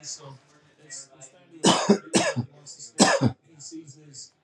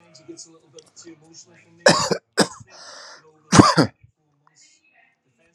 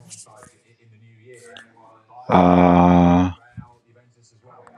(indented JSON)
{
  "three_cough_length": "4.4 s",
  "three_cough_amplitude": 23361,
  "three_cough_signal_mean_std_ratio": 0.4,
  "cough_length": "5.5 s",
  "cough_amplitude": 32768,
  "cough_signal_mean_std_ratio": 0.27,
  "exhalation_length": "4.8 s",
  "exhalation_amplitude": 30911,
  "exhalation_signal_mean_std_ratio": 0.39,
  "survey_phase": "beta (2021-08-13 to 2022-03-07)",
  "age": "45-64",
  "gender": "Male",
  "wearing_mask": "No",
  "symptom_none": true,
  "smoker_status": "Never smoked",
  "respiratory_condition_asthma": false,
  "respiratory_condition_other": false,
  "recruitment_source": "REACT",
  "submission_delay": "4 days",
  "covid_test_result": "Negative",
  "covid_test_method": "RT-qPCR"
}